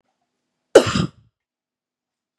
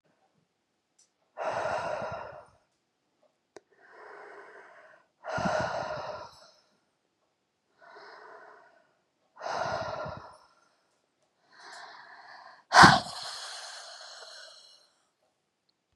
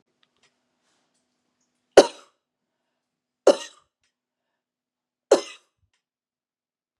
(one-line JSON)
{"cough_length": "2.4 s", "cough_amplitude": 32768, "cough_signal_mean_std_ratio": 0.21, "exhalation_length": "16.0 s", "exhalation_amplitude": 26486, "exhalation_signal_mean_std_ratio": 0.26, "three_cough_length": "7.0 s", "three_cough_amplitude": 32768, "three_cough_signal_mean_std_ratio": 0.13, "survey_phase": "beta (2021-08-13 to 2022-03-07)", "age": "45-64", "gender": "Female", "wearing_mask": "No", "symptom_change_to_sense_of_smell_or_taste": true, "symptom_onset": "12 days", "smoker_status": "Ex-smoker", "respiratory_condition_asthma": false, "respiratory_condition_other": false, "recruitment_source": "REACT", "submission_delay": "1 day", "covid_test_result": "Positive", "covid_test_method": "RT-qPCR", "covid_ct_value": 33.0, "covid_ct_gene": "E gene", "influenza_a_test_result": "Negative", "influenza_b_test_result": "Negative"}